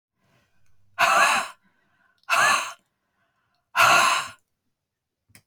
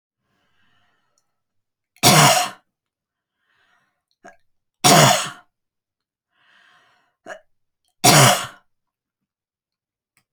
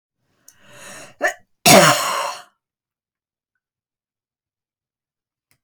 {"exhalation_length": "5.5 s", "exhalation_amplitude": 20831, "exhalation_signal_mean_std_ratio": 0.41, "three_cough_length": "10.3 s", "three_cough_amplitude": 32768, "three_cough_signal_mean_std_ratio": 0.28, "cough_length": "5.6 s", "cough_amplitude": 32768, "cough_signal_mean_std_ratio": 0.26, "survey_phase": "alpha (2021-03-01 to 2021-08-12)", "age": "45-64", "gender": "Female", "wearing_mask": "No", "symptom_none": true, "smoker_status": "Never smoked", "respiratory_condition_asthma": false, "respiratory_condition_other": false, "recruitment_source": "REACT", "submission_delay": "2 days", "covid_test_result": "Negative", "covid_test_method": "RT-qPCR"}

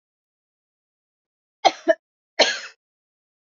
{"cough_length": "3.6 s", "cough_amplitude": 26292, "cough_signal_mean_std_ratio": 0.21, "survey_phase": "alpha (2021-03-01 to 2021-08-12)", "age": "65+", "gender": "Female", "wearing_mask": "No", "symptom_cough_any": true, "symptom_fatigue": true, "symptom_headache": true, "symptom_change_to_sense_of_smell_or_taste": true, "symptom_onset": "3 days", "smoker_status": "Never smoked", "respiratory_condition_asthma": false, "respiratory_condition_other": false, "recruitment_source": "Test and Trace", "submission_delay": "1 day", "covid_test_result": "Positive", "covid_test_method": "RT-qPCR"}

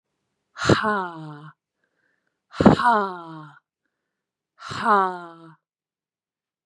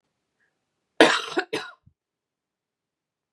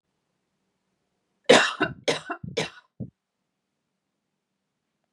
{"exhalation_length": "6.7 s", "exhalation_amplitude": 32767, "exhalation_signal_mean_std_ratio": 0.33, "cough_length": "3.3 s", "cough_amplitude": 32767, "cough_signal_mean_std_ratio": 0.23, "three_cough_length": "5.1 s", "three_cough_amplitude": 29581, "three_cough_signal_mean_std_ratio": 0.24, "survey_phase": "beta (2021-08-13 to 2022-03-07)", "age": "18-44", "gender": "Female", "wearing_mask": "No", "symptom_cough_any": true, "symptom_runny_or_blocked_nose": true, "symptom_sore_throat": true, "symptom_fatigue": true, "smoker_status": "Current smoker (e-cigarettes or vapes only)", "respiratory_condition_asthma": false, "respiratory_condition_other": false, "recruitment_source": "Test and Trace", "submission_delay": "1 day", "covid_test_result": "Positive", "covid_test_method": "LFT"}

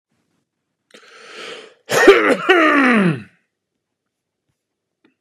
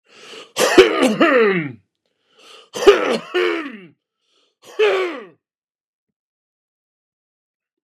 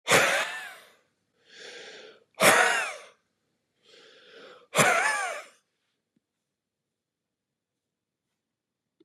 {"cough_length": "5.2 s", "cough_amplitude": 32768, "cough_signal_mean_std_ratio": 0.39, "three_cough_length": "7.9 s", "three_cough_amplitude": 32768, "three_cough_signal_mean_std_ratio": 0.4, "exhalation_length": "9.0 s", "exhalation_amplitude": 21466, "exhalation_signal_mean_std_ratio": 0.34, "survey_phase": "beta (2021-08-13 to 2022-03-07)", "age": "65+", "gender": "Male", "wearing_mask": "No", "symptom_none": true, "smoker_status": "Never smoked", "respiratory_condition_asthma": false, "respiratory_condition_other": false, "recruitment_source": "REACT", "submission_delay": "2 days", "covid_test_result": "Negative", "covid_test_method": "RT-qPCR", "influenza_a_test_result": "Negative", "influenza_b_test_result": "Negative"}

